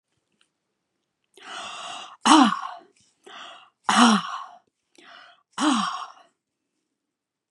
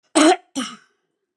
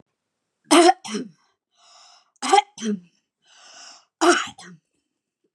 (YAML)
exhalation_length: 7.5 s
exhalation_amplitude: 31059
exhalation_signal_mean_std_ratio: 0.33
cough_length: 1.4 s
cough_amplitude: 29580
cough_signal_mean_std_ratio: 0.38
three_cough_length: 5.5 s
three_cough_amplitude: 30907
three_cough_signal_mean_std_ratio: 0.3
survey_phase: beta (2021-08-13 to 2022-03-07)
age: 45-64
gender: Female
wearing_mask: 'No'
symptom_none: true
smoker_status: Never smoked
respiratory_condition_asthma: false
respiratory_condition_other: false
recruitment_source: REACT
submission_delay: 2 days
covid_test_result: Negative
covid_test_method: RT-qPCR
influenza_a_test_result: Negative
influenza_b_test_result: Negative